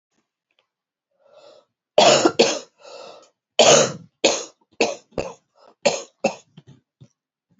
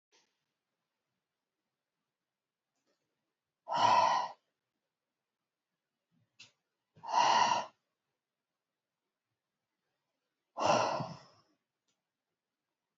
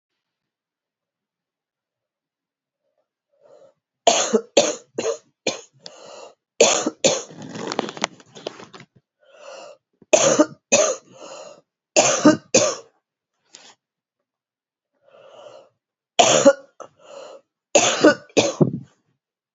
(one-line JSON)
{"cough_length": "7.6 s", "cough_amplitude": 29505, "cough_signal_mean_std_ratio": 0.33, "exhalation_length": "13.0 s", "exhalation_amplitude": 5885, "exhalation_signal_mean_std_ratio": 0.28, "three_cough_length": "19.5 s", "three_cough_amplitude": 32767, "three_cough_signal_mean_std_ratio": 0.33, "survey_phase": "beta (2021-08-13 to 2022-03-07)", "age": "65+", "gender": "Female", "wearing_mask": "No", "symptom_cough_any": true, "symptom_new_continuous_cough": true, "symptom_runny_or_blocked_nose": true, "symptom_shortness_of_breath": true, "symptom_sore_throat": true, "symptom_abdominal_pain": true, "symptom_fatigue": true, "symptom_fever_high_temperature": true, "symptom_headache": true, "symptom_onset": "3 days", "smoker_status": "Ex-smoker", "respiratory_condition_asthma": true, "respiratory_condition_other": false, "recruitment_source": "Test and Trace", "submission_delay": "1 day", "covid_test_result": "Positive", "covid_test_method": "RT-qPCR"}